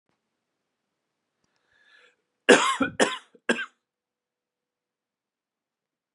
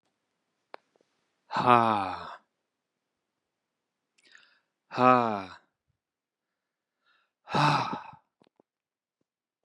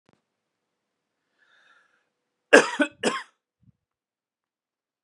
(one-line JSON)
{"cough_length": "6.1 s", "cough_amplitude": 29018, "cough_signal_mean_std_ratio": 0.22, "exhalation_length": "9.6 s", "exhalation_amplitude": 18162, "exhalation_signal_mean_std_ratio": 0.27, "three_cough_length": "5.0 s", "three_cough_amplitude": 32457, "three_cough_signal_mean_std_ratio": 0.18, "survey_phase": "beta (2021-08-13 to 2022-03-07)", "age": "18-44", "gender": "Male", "wearing_mask": "No", "symptom_none": true, "smoker_status": "Ex-smoker", "respiratory_condition_asthma": false, "respiratory_condition_other": false, "recruitment_source": "REACT", "submission_delay": "1 day", "covid_test_result": "Negative", "covid_test_method": "RT-qPCR", "influenza_a_test_result": "Negative", "influenza_b_test_result": "Negative"}